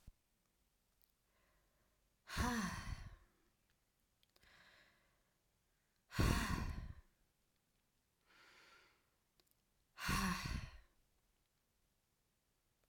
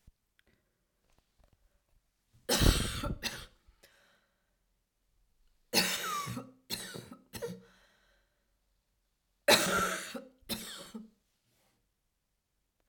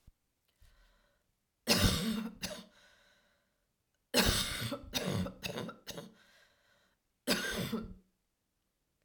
exhalation_length: 12.9 s
exhalation_amplitude: 2641
exhalation_signal_mean_std_ratio: 0.33
three_cough_length: 12.9 s
three_cough_amplitude: 11116
three_cough_signal_mean_std_ratio: 0.32
cough_length: 9.0 s
cough_amplitude: 7944
cough_signal_mean_std_ratio: 0.42
survey_phase: alpha (2021-03-01 to 2021-08-12)
age: 18-44
gender: Female
wearing_mask: 'No'
symptom_fatigue: true
symptom_headache: true
symptom_onset: 7 days
smoker_status: Never smoked
respiratory_condition_asthma: false
respiratory_condition_other: false
recruitment_source: REACT
submission_delay: 1 day
covid_test_result: Negative
covid_test_method: RT-qPCR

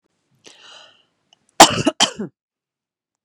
cough_length: 3.2 s
cough_amplitude: 32768
cough_signal_mean_std_ratio: 0.22
survey_phase: beta (2021-08-13 to 2022-03-07)
age: 45-64
gender: Female
wearing_mask: 'No'
symptom_other: true
smoker_status: Ex-smoker
respiratory_condition_asthma: true
respiratory_condition_other: false
recruitment_source: Test and Trace
submission_delay: 2 days
covid_test_result: Positive
covid_test_method: LFT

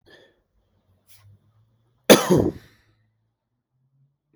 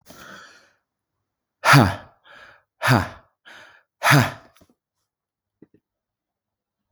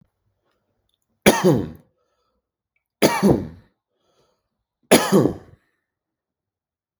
cough_length: 4.4 s
cough_amplitude: 32768
cough_signal_mean_std_ratio: 0.21
exhalation_length: 6.9 s
exhalation_amplitude: 32766
exhalation_signal_mean_std_ratio: 0.27
three_cough_length: 7.0 s
three_cough_amplitude: 32768
three_cough_signal_mean_std_ratio: 0.3
survey_phase: beta (2021-08-13 to 2022-03-07)
age: 18-44
gender: Male
wearing_mask: 'No'
symptom_none: true
smoker_status: Never smoked
respiratory_condition_asthma: false
respiratory_condition_other: false
recruitment_source: REACT
submission_delay: 1 day
covid_test_result: Negative
covid_test_method: RT-qPCR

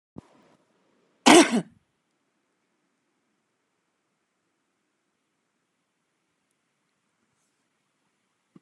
cough_length: 8.6 s
cough_amplitude: 31115
cough_signal_mean_std_ratio: 0.14
survey_phase: alpha (2021-03-01 to 2021-08-12)
age: 65+
gender: Female
wearing_mask: 'No'
symptom_none: true
smoker_status: Never smoked
respiratory_condition_asthma: false
respiratory_condition_other: false
recruitment_source: REACT
submission_delay: 1 day
covid_test_result: Negative
covid_test_method: RT-qPCR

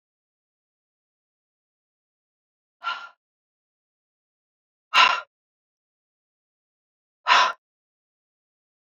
exhalation_length: 8.9 s
exhalation_amplitude: 24238
exhalation_signal_mean_std_ratio: 0.19
survey_phase: beta (2021-08-13 to 2022-03-07)
age: 45-64
gender: Female
wearing_mask: 'No'
symptom_none: true
smoker_status: Never smoked
respiratory_condition_asthma: false
respiratory_condition_other: false
recruitment_source: REACT
submission_delay: 1 day
covid_test_result: Negative
covid_test_method: RT-qPCR
influenza_a_test_result: Negative
influenza_b_test_result: Negative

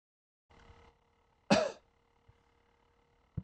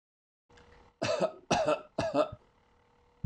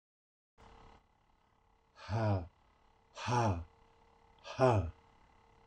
cough_length: 3.4 s
cough_amplitude: 7908
cough_signal_mean_std_ratio: 0.21
three_cough_length: 3.3 s
three_cough_amplitude: 7134
three_cough_signal_mean_std_ratio: 0.44
exhalation_length: 5.7 s
exhalation_amplitude: 5524
exhalation_signal_mean_std_ratio: 0.37
survey_phase: beta (2021-08-13 to 2022-03-07)
age: 65+
gender: Male
wearing_mask: 'No'
symptom_none: true
smoker_status: Never smoked
respiratory_condition_asthma: false
respiratory_condition_other: false
recruitment_source: REACT
submission_delay: 6 days
covid_test_result: Negative
covid_test_method: RT-qPCR
influenza_a_test_result: Negative
influenza_b_test_result: Negative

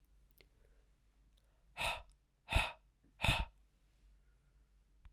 exhalation_length: 5.1 s
exhalation_amplitude: 4960
exhalation_signal_mean_std_ratio: 0.29
survey_phase: alpha (2021-03-01 to 2021-08-12)
age: 18-44
gender: Male
wearing_mask: 'No'
symptom_cough_any: true
symptom_fatigue: true
symptom_fever_high_temperature: true
symptom_headache: true
smoker_status: Never smoked
respiratory_condition_asthma: false
respiratory_condition_other: false
recruitment_source: Test and Trace
submission_delay: 1 day
covid_test_result: Positive
covid_test_method: RT-qPCR
covid_ct_value: 15.4
covid_ct_gene: ORF1ab gene
covid_ct_mean: 16.6
covid_viral_load: 3700000 copies/ml
covid_viral_load_category: High viral load (>1M copies/ml)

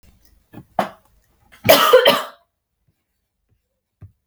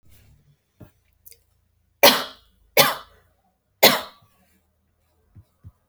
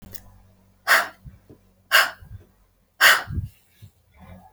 cough_length: 4.3 s
cough_amplitude: 32338
cough_signal_mean_std_ratio: 0.3
three_cough_length: 5.9 s
three_cough_amplitude: 32768
three_cough_signal_mean_std_ratio: 0.22
exhalation_length: 4.5 s
exhalation_amplitude: 28501
exhalation_signal_mean_std_ratio: 0.32
survey_phase: beta (2021-08-13 to 2022-03-07)
age: 18-44
gender: Female
wearing_mask: 'No'
symptom_none: true
smoker_status: Never smoked
respiratory_condition_asthma: false
respiratory_condition_other: false
recruitment_source: REACT
submission_delay: 2 days
covid_test_result: Negative
covid_test_method: RT-qPCR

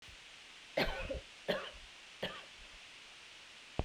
cough_length: 3.8 s
cough_amplitude: 5136
cough_signal_mean_std_ratio: 0.53
survey_phase: beta (2021-08-13 to 2022-03-07)
age: 45-64
gender: Female
wearing_mask: 'No'
symptom_none: true
smoker_status: Never smoked
respiratory_condition_asthma: false
respiratory_condition_other: false
recruitment_source: REACT
submission_delay: 2 days
covid_test_result: Negative
covid_test_method: RT-qPCR
influenza_a_test_result: Unknown/Void
influenza_b_test_result: Unknown/Void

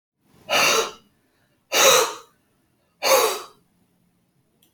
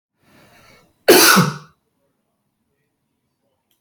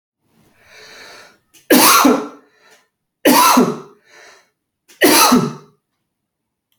exhalation_length: 4.7 s
exhalation_amplitude: 25263
exhalation_signal_mean_std_ratio: 0.4
cough_length: 3.8 s
cough_amplitude: 32767
cough_signal_mean_std_ratio: 0.28
three_cough_length: 6.8 s
three_cough_amplitude: 32768
three_cough_signal_mean_std_ratio: 0.41
survey_phase: beta (2021-08-13 to 2022-03-07)
age: 45-64
gender: Male
wearing_mask: 'No'
symptom_none: true
smoker_status: Never smoked
respiratory_condition_asthma: false
respiratory_condition_other: false
recruitment_source: REACT
submission_delay: 1 day
covid_test_result: Negative
covid_test_method: RT-qPCR
covid_ct_value: 46.0
covid_ct_gene: N gene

